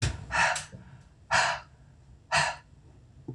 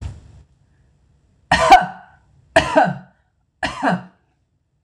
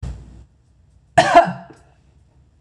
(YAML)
exhalation_length: 3.3 s
exhalation_amplitude: 8907
exhalation_signal_mean_std_ratio: 0.49
three_cough_length: 4.8 s
three_cough_amplitude: 26028
three_cough_signal_mean_std_ratio: 0.34
cough_length: 2.6 s
cough_amplitude: 26028
cough_signal_mean_std_ratio: 0.3
survey_phase: beta (2021-08-13 to 2022-03-07)
age: 45-64
gender: Female
wearing_mask: 'No'
symptom_none: true
smoker_status: Ex-smoker
respiratory_condition_asthma: false
respiratory_condition_other: false
recruitment_source: REACT
submission_delay: 7 days
covid_test_result: Negative
covid_test_method: RT-qPCR
influenza_a_test_result: Negative
influenza_b_test_result: Negative